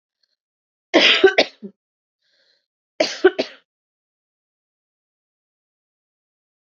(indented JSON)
{
  "cough_length": "6.7 s",
  "cough_amplitude": 32768,
  "cough_signal_mean_std_ratio": 0.24,
  "survey_phase": "beta (2021-08-13 to 2022-03-07)",
  "age": "18-44",
  "gender": "Female",
  "wearing_mask": "No",
  "symptom_cough_any": true,
  "symptom_runny_or_blocked_nose": true,
  "symptom_sore_throat": true,
  "symptom_fatigue": true,
  "symptom_headache": true,
  "symptom_onset": "4 days",
  "smoker_status": "Never smoked",
  "respiratory_condition_asthma": true,
  "respiratory_condition_other": false,
  "recruitment_source": "Test and Trace",
  "submission_delay": "1 day",
  "covid_test_result": "Positive",
  "covid_test_method": "RT-qPCR",
  "covid_ct_value": 31.0,
  "covid_ct_gene": "N gene"
}